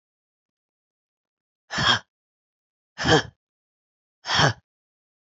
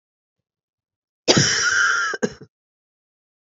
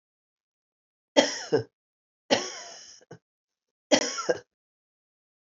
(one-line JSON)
{"exhalation_length": "5.4 s", "exhalation_amplitude": 22411, "exhalation_signal_mean_std_ratio": 0.28, "cough_length": "3.5 s", "cough_amplitude": 32412, "cough_signal_mean_std_ratio": 0.42, "three_cough_length": "5.5 s", "three_cough_amplitude": 24003, "three_cough_signal_mean_std_ratio": 0.28, "survey_phase": "beta (2021-08-13 to 2022-03-07)", "age": "45-64", "gender": "Female", "wearing_mask": "No", "symptom_cough_any": true, "symptom_runny_or_blocked_nose": true, "symptom_sore_throat": true, "symptom_abdominal_pain": true, "symptom_fatigue": true, "symptom_fever_high_temperature": true, "symptom_headache": true, "symptom_change_to_sense_of_smell_or_taste": true, "smoker_status": "Never smoked", "respiratory_condition_asthma": true, "respiratory_condition_other": false, "recruitment_source": "Test and Trace", "submission_delay": "1 day", "covid_test_result": "Positive", "covid_test_method": "LFT"}